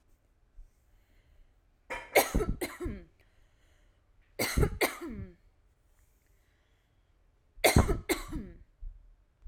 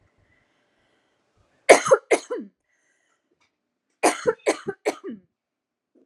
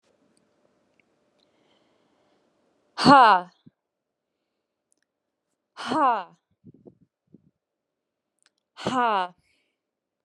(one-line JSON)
{"three_cough_length": "9.5 s", "three_cough_amplitude": 11757, "three_cough_signal_mean_std_ratio": 0.33, "cough_length": "6.1 s", "cough_amplitude": 32768, "cough_signal_mean_std_ratio": 0.24, "exhalation_length": "10.2 s", "exhalation_amplitude": 27635, "exhalation_signal_mean_std_ratio": 0.23, "survey_phase": "alpha (2021-03-01 to 2021-08-12)", "age": "18-44", "gender": "Female", "wearing_mask": "No", "symptom_fatigue": true, "smoker_status": "Ex-smoker", "respiratory_condition_asthma": true, "respiratory_condition_other": false, "recruitment_source": "REACT", "submission_delay": "1 day", "covid_test_result": "Negative", "covid_test_method": "RT-qPCR"}